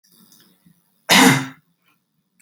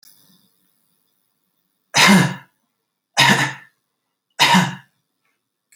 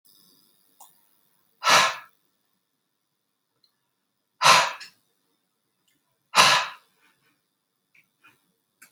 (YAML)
cough_length: 2.4 s
cough_amplitude: 30410
cough_signal_mean_std_ratio: 0.31
three_cough_length: 5.8 s
three_cough_amplitude: 31938
three_cough_signal_mean_std_ratio: 0.34
exhalation_length: 8.9 s
exhalation_amplitude: 28085
exhalation_signal_mean_std_ratio: 0.25
survey_phase: alpha (2021-03-01 to 2021-08-12)
age: 45-64
gender: Female
wearing_mask: 'No'
symptom_none: true
smoker_status: Ex-smoker
respiratory_condition_asthma: false
respiratory_condition_other: false
recruitment_source: REACT
submission_delay: 2 days
covid_test_result: Negative
covid_test_method: RT-qPCR